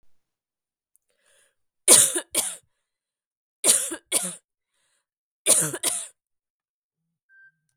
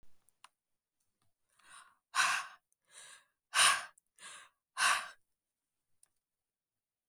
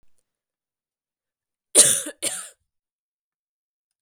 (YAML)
three_cough_length: 7.8 s
three_cough_amplitude: 32768
three_cough_signal_mean_std_ratio: 0.28
exhalation_length: 7.1 s
exhalation_amplitude: 7157
exhalation_signal_mean_std_ratio: 0.28
cough_length: 4.0 s
cough_amplitude: 32768
cough_signal_mean_std_ratio: 0.22
survey_phase: beta (2021-08-13 to 2022-03-07)
age: 18-44
gender: Female
wearing_mask: 'No'
symptom_cough_any: true
symptom_diarrhoea: true
symptom_onset: 8 days
smoker_status: Never smoked
respiratory_condition_asthma: false
respiratory_condition_other: false
recruitment_source: REACT
submission_delay: 1 day
covid_test_result: Negative
covid_test_method: RT-qPCR
influenza_a_test_result: Unknown/Void
influenza_b_test_result: Unknown/Void